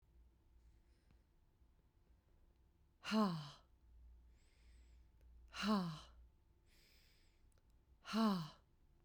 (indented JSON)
{
  "exhalation_length": "9.0 s",
  "exhalation_amplitude": 1783,
  "exhalation_signal_mean_std_ratio": 0.34,
  "survey_phase": "beta (2021-08-13 to 2022-03-07)",
  "age": "45-64",
  "gender": "Female",
  "wearing_mask": "No",
  "symptom_sore_throat": true,
  "symptom_fatigue": true,
  "symptom_headache": true,
  "symptom_other": true,
  "smoker_status": "Never smoked",
  "respiratory_condition_asthma": false,
  "respiratory_condition_other": false,
  "recruitment_source": "Test and Trace",
  "submission_delay": "2 days",
  "covid_test_result": "Positive",
  "covid_test_method": "LFT"
}